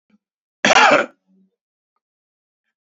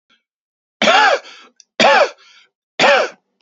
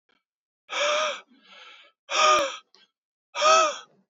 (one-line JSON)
{"cough_length": "2.8 s", "cough_amplitude": 28798, "cough_signal_mean_std_ratio": 0.3, "three_cough_length": "3.4 s", "three_cough_amplitude": 31675, "three_cough_signal_mean_std_ratio": 0.46, "exhalation_length": "4.1 s", "exhalation_amplitude": 16088, "exhalation_signal_mean_std_ratio": 0.45, "survey_phase": "beta (2021-08-13 to 2022-03-07)", "age": "45-64", "gender": "Male", "wearing_mask": "No", "symptom_cough_any": true, "symptom_runny_or_blocked_nose": true, "symptom_sore_throat": true, "symptom_fatigue": true, "symptom_headache": true, "symptom_onset": "3 days", "smoker_status": "Ex-smoker", "respiratory_condition_asthma": false, "respiratory_condition_other": false, "recruitment_source": "Test and Trace", "submission_delay": "2 days", "covid_test_result": "Positive", "covid_test_method": "ePCR"}